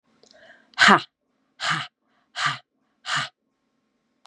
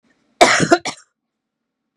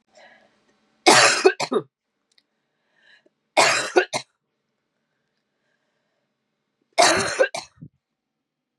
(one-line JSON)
{"exhalation_length": "4.3 s", "exhalation_amplitude": 32037, "exhalation_signal_mean_std_ratio": 0.28, "cough_length": "2.0 s", "cough_amplitude": 32768, "cough_signal_mean_std_ratio": 0.32, "three_cough_length": "8.8 s", "three_cough_amplitude": 31625, "three_cough_signal_mean_std_ratio": 0.31, "survey_phase": "beta (2021-08-13 to 2022-03-07)", "age": "45-64", "gender": "Female", "wearing_mask": "No", "symptom_cough_any": true, "symptom_runny_or_blocked_nose": true, "symptom_sore_throat": true, "symptom_fatigue": true, "symptom_headache": true, "symptom_onset": "4 days", "smoker_status": "Never smoked", "respiratory_condition_asthma": false, "respiratory_condition_other": false, "recruitment_source": "Test and Trace", "submission_delay": "2 days", "covid_test_result": "Positive", "covid_test_method": "RT-qPCR"}